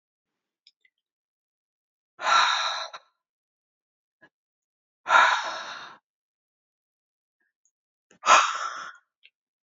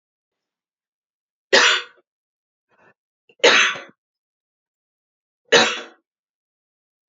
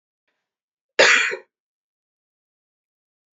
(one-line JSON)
{"exhalation_length": "9.6 s", "exhalation_amplitude": 23551, "exhalation_signal_mean_std_ratio": 0.29, "three_cough_length": "7.1 s", "three_cough_amplitude": 29615, "three_cough_signal_mean_std_ratio": 0.27, "cough_length": "3.3 s", "cough_amplitude": 27478, "cough_signal_mean_std_ratio": 0.24, "survey_phase": "beta (2021-08-13 to 2022-03-07)", "age": "45-64", "gender": "Female", "wearing_mask": "No", "symptom_cough_any": true, "symptom_runny_or_blocked_nose": true, "symptom_headache": true, "symptom_onset": "2 days", "smoker_status": "Ex-smoker", "respiratory_condition_asthma": false, "respiratory_condition_other": false, "recruitment_source": "Test and Trace", "submission_delay": "1 day", "covid_test_result": "Positive", "covid_test_method": "RT-qPCR", "covid_ct_value": 28.1, "covid_ct_gene": "ORF1ab gene"}